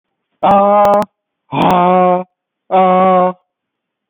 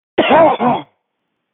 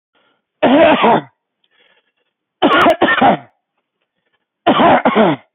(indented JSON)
{
  "exhalation_length": "4.1 s",
  "exhalation_amplitude": 28521,
  "exhalation_signal_mean_std_ratio": 0.62,
  "cough_length": "1.5 s",
  "cough_amplitude": 30670,
  "cough_signal_mean_std_ratio": 0.54,
  "three_cough_length": "5.5 s",
  "three_cough_amplitude": 31563,
  "three_cough_signal_mean_std_ratio": 0.52,
  "survey_phase": "beta (2021-08-13 to 2022-03-07)",
  "age": "45-64",
  "gender": "Female",
  "wearing_mask": "No",
  "symptom_cough_any": true,
  "symptom_runny_or_blocked_nose": true,
  "symptom_sore_throat": true,
  "symptom_fatigue": true,
  "smoker_status": "Ex-smoker",
  "respiratory_condition_asthma": false,
  "respiratory_condition_other": false,
  "recruitment_source": "Test and Trace",
  "submission_delay": "2 days",
  "covid_test_result": "Positive",
  "covid_test_method": "ePCR"
}